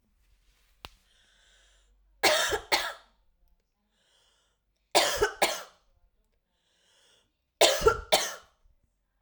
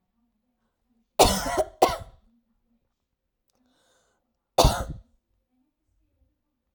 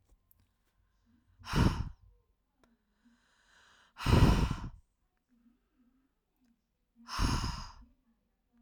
three_cough_length: 9.2 s
three_cough_amplitude: 19390
three_cough_signal_mean_std_ratio: 0.31
cough_length: 6.7 s
cough_amplitude: 27432
cough_signal_mean_std_ratio: 0.25
exhalation_length: 8.6 s
exhalation_amplitude: 8895
exhalation_signal_mean_std_ratio: 0.31
survey_phase: alpha (2021-03-01 to 2021-08-12)
age: 18-44
gender: Female
wearing_mask: 'No'
symptom_fatigue: true
symptom_headache: true
symptom_onset: 12 days
smoker_status: Never smoked
respiratory_condition_asthma: false
respiratory_condition_other: false
recruitment_source: REACT
submission_delay: 1 day
covid_test_result: Negative
covid_test_method: RT-qPCR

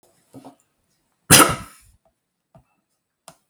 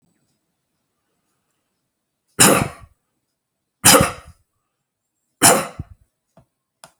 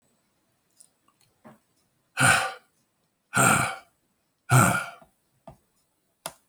cough_length: 3.5 s
cough_amplitude: 32768
cough_signal_mean_std_ratio: 0.2
three_cough_length: 7.0 s
three_cough_amplitude: 32768
three_cough_signal_mean_std_ratio: 0.25
exhalation_length: 6.5 s
exhalation_amplitude: 19063
exhalation_signal_mean_std_ratio: 0.32
survey_phase: beta (2021-08-13 to 2022-03-07)
age: 65+
gender: Male
wearing_mask: 'No'
symptom_fatigue: true
symptom_onset: 12 days
smoker_status: Never smoked
respiratory_condition_asthma: false
respiratory_condition_other: false
recruitment_source: REACT
submission_delay: 1 day
covid_test_result: Negative
covid_test_method: RT-qPCR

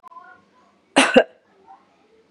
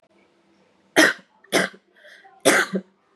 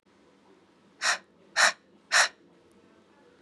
cough_length: 2.3 s
cough_amplitude: 32767
cough_signal_mean_std_ratio: 0.26
three_cough_length: 3.2 s
three_cough_amplitude: 32767
three_cough_signal_mean_std_ratio: 0.34
exhalation_length: 3.4 s
exhalation_amplitude: 14927
exhalation_signal_mean_std_ratio: 0.3
survey_phase: beta (2021-08-13 to 2022-03-07)
age: 18-44
gender: Female
wearing_mask: 'Yes'
symptom_runny_or_blocked_nose: true
symptom_sore_throat: true
symptom_fatigue: true
symptom_headache: true
smoker_status: Never smoked
respiratory_condition_asthma: false
respiratory_condition_other: false
recruitment_source: Test and Trace
submission_delay: 1 day
covid_test_result: Positive
covid_test_method: RT-qPCR
covid_ct_value: 24.9
covid_ct_gene: ORF1ab gene
covid_ct_mean: 25.5
covid_viral_load: 4400 copies/ml
covid_viral_load_category: Minimal viral load (< 10K copies/ml)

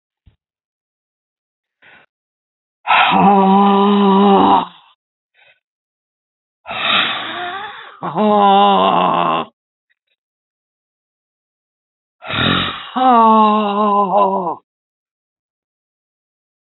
exhalation_length: 16.6 s
exhalation_amplitude: 31989
exhalation_signal_mean_std_ratio: 0.5
survey_phase: beta (2021-08-13 to 2022-03-07)
age: 65+
gender: Female
wearing_mask: 'No'
symptom_cough_any: true
symptom_fatigue: true
symptom_headache: true
symptom_onset: 11 days
smoker_status: Ex-smoker
respiratory_condition_asthma: false
respiratory_condition_other: false
recruitment_source: REACT
submission_delay: 1 day
covid_test_result: Negative
covid_test_method: RT-qPCR
influenza_a_test_result: Negative
influenza_b_test_result: Negative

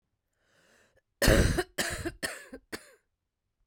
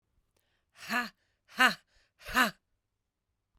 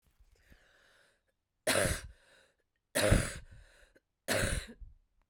cough_length: 3.7 s
cough_amplitude: 12934
cough_signal_mean_std_ratio: 0.34
exhalation_length: 3.6 s
exhalation_amplitude: 13628
exhalation_signal_mean_std_ratio: 0.26
three_cough_length: 5.3 s
three_cough_amplitude: 7432
three_cough_signal_mean_std_ratio: 0.36
survey_phase: beta (2021-08-13 to 2022-03-07)
age: 45-64
gender: Female
wearing_mask: 'No'
symptom_cough_any: true
symptom_runny_or_blocked_nose: true
symptom_sore_throat: true
symptom_headache: true
symptom_change_to_sense_of_smell_or_taste: true
symptom_onset: 5 days
smoker_status: Ex-smoker
respiratory_condition_asthma: false
respiratory_condition_other: false
recruitment_source: Test and Trace
submission_delay: 4 days
covid_test_result: Negative
covid_test_method: RT-qPCR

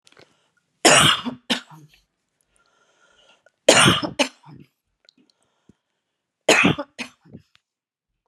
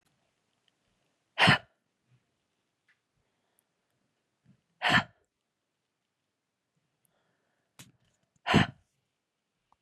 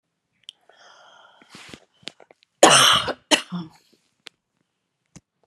three_cough_length: 8.3 s
three_cough_amplitude: 32768
three_cough_signal_mean_std_ratio: 0.3
exhalation_length: 9.8 s
exhalation_amplitude: 12443
exhalation_signal_mean_std_ratio: 0.19
cough_length: 5.5 s
cough_amplitude: 32768
cough_signal_mean_std_ratio: 0.26
survey_phase: beta (2021-08-13 to 2022-03-07)
age: 45-64
gender: Female
wearing_mask: 'No'
symptom_none: true
symptom_onset: 5 days
smoker_status: Never smoked
respiratory_condition_asthma: false
respiratory_condition_other: false
recruitment_source: REACT
submission_delay: 3 days
covid_test_result: Negative
covid_test_method: RT-qPCR
influenza_a_test_result: Negative
influenza_b_test_result: Negative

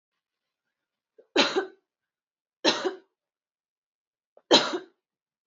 three_cough_length: 5.5 s
three_cough_amplitude: 19766
three_cough_signal_mean_std_ratio: 0.26
survey_phase: beta (2021-08-13 to 2022-03-07)
age: 18-44
gender: Female
wearing_mask: 'No'
symptom_runny_or_blocked_nose: true
symptom_onset: 8 days
smoker_status: Never smoked
respiratory_condition_asthma: false
respiratory_condition_other: false
recruitment_source: REACT
submission_delay: 1 day
covid_test_result: Negative
covid_test_method: RT-qPCR
influenza_a_test_result: Negative
influenza_b_test_result: Negative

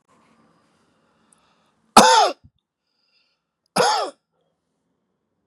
cough_length: 5.5 s
cough_amplitude: 32768
cough_signal_mean_std_ratio: 0.26
survey_phase: beta (2021-08-13 to 2022-03-07)
age: 65+
gender: Male
wearing_mask: 'No'
symptom_none: true
smoker_status: Never smoked
respiratory_condition_asthma: false
respiratory_condition_other: false
recruitment_source: Test and Trace
submission_delay: 2 days
covid_test_result: Positive
covid_test_method: LFT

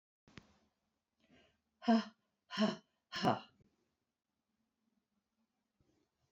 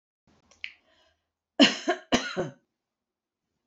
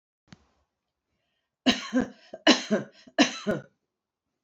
exhalation_length: 6.3 s
exhalation_amplitude: 3768
exhalation_signal_mean_std_ratio: 0.23
cough_length: 3.7 s
cough_amplitude: 22960
cough_signal_mean_std_ratio: 0.26
three_cough_length: 4.4 s
three_cough_amplitude: 20008
three_cough_signal_mean_std_ratio: 0.31
survey_phase: beta (2021-08-13 to 2022-03-07)
age: 45-64
gender: Female
wearing_mask: 'No'
symptom_cough_any: true
symptom_sore_throat: true
symptom_fatigue: true
symptom_onset: 6 days
smoker_status: Never smoked
respiratory_condition_asthma: false
respiratory_condition_other: false
recruitment_source: Test and Trace
submission_delay: 1 day
covid_test_result: Negative
covid_test_method: ePCR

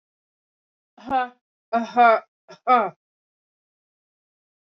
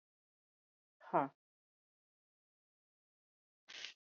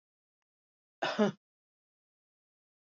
three_cough_length: 4.6 s
three_cough_amplitude: 21147
three_cough_signal_mean_std_ratio: 0.31
exhalation_length: 4.0 s
exhalation_amplitude: 3016
exhalation_signal_mean_std_ratio: 0.16
cough_length: 3.0 s
cough_amplitude: 5339
cough_signal_mean_std_ratio: 0.21
survey_phase: beta (2021-08-13 to 2022-03-07)
age: 45-64
gender: Female
wearing_mask: 'No'
symptom_none: true
smoker_status: Ex-smoker
respiratory_condition_asthma: false
respiratory_condition_other: false
recruitment_source: REACT
submission_delay: 1 day
covid_test_result: Positive
covid_test_method: RT-qPCR
covid_ct_value: 24.6
covid_ct_gene: E gene
influenza_a_test_result: Negative
influenza_b_test_result: Negative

